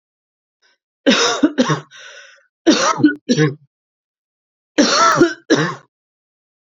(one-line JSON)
{"three_cough_length": "6.7 s", "three_cough_amplitude": 29080, "three_cough_signal_mean_std_ratio": 0.46, "survey_phase": "beta (2021-08-13 to 2022-03-07)", "age": "18-44", "gender": "Female", "wearing_mask": "No", "symptom_cough_any": true, "symptom_runny_or_blocked_nose": true, "symptom_sore_throat": true, "symptom_fatigue": true, "symptom_headache": true, "symptom_change_to_sense_of_smell_or_taste": true, "symptom_loss_of_taste": true, "symptom_onset": "2 days", "smoker_status": "Ex-smoker", "respiratory_condition_asthma": false, "respiratory_condition_other": false, "recruitment_source": "Test and Trace", "submission_delay": "1 day", "covid_test_result": "Positive", "covid_test_method": "RT-qPCR", "covid_ct_value": 21.2, "covid_ct_gene": "ORF1ab gene"}